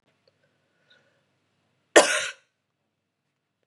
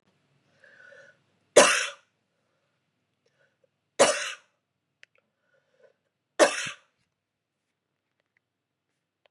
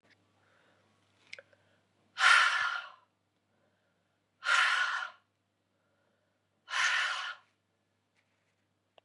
{"cough_length": "3.7 s", "cough_amplitude": 31841, "cough_signal_mean_std_ratio": 0.18, "three_cough_length": "9.3 s", "three_cough_amplitude": 24369, "three_cough_signal_mean_std_ratio": 0.2, "exhalation_length": "9.0 s", "exhalation_amplitude": 9194, "exhalation_signal_mean_std_ratio": 0.34, "survey_phase": "beta (2021-08-13 to 2022-03-07)", "age": "45-64", "gender": "Female", "wearing_mask": "No", "symptom_cough_any": true, "symptom_runny_or_blocked_nose": true, "symptom_fatigue": true, "symptom_other": true, "symptom_onset": "3 days", "smoker_status": "Never smoked", "respiratory_condition_asthma": false, "respiratory_condition_other": false, "recruitment_source": "Test and Trace", "submission_delay": "1 day", "covid_test_result": "Positive", "covid_test_method": "RT-qPCR", "covid_ct_value": 22.8, "covid_ct_gene": "ORF1ab gene"}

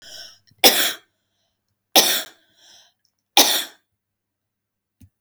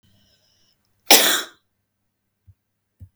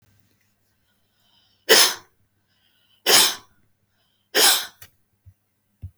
{"three_cough_length": "5.2 s", "three_cough_amplitude": 32768, "three_cough_signal_mean_std_ratio": 0.29, "cough_length": "3.2 s", "cough_amplitude": 32768, "cough_signal_mean_std_ratio": 0.23, "exhalation_length": "6.0 s", "exhalation_amplitude": 32766, "exhalation_signal_mean_std_ratio": 0.29, "survey_phase": "beta (2021-08-13 to 2022-03-07)", "age": "65+", "gender": "Female", "wearing_mask": "No", "symptom_none": true, "smoker_status": "Never smoked", "respiratory_condition_asthma": false, "respiratory_condition_other": false, "recruitment_source": "REACT", "submission_delay": "1 day", "covid_test_result": "Negative", "covid_test_method": "RT-qPCR", "influenza_a_test_result": "Negative", "influenza_b_test_result": "Negative"}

